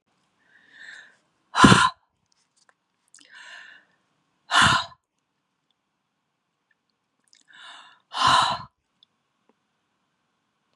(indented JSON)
{
  "exhalation_length": "10.8 s",
  "exhalation_amplitude": 32767,
  "exhalation_signal_mean_std_ratio": 0.25,
  "survey_phase": "beta (2021-08-13 to 2022-03-07)",
  "age": "18-44",
  "gender": "Female",
  "wearing_mask": "No",
  "symptom_cough_any": true,
  "symptom_onset": "5 days",
  "smoker_status": "Never smoked",
  "respiratory_condition_asthma": false,
  "respiratory_condition_other": false,
  "recruitment_source": "REACT",
  "submission_delay": "2 days",
  "covid_test_result": "Negative",
  "covid_test_method": "RT-qPCR",
  "influenza_a_test_result": "Unknown/Void",
  "influenza_b_test_result": "Unknown/Void"
}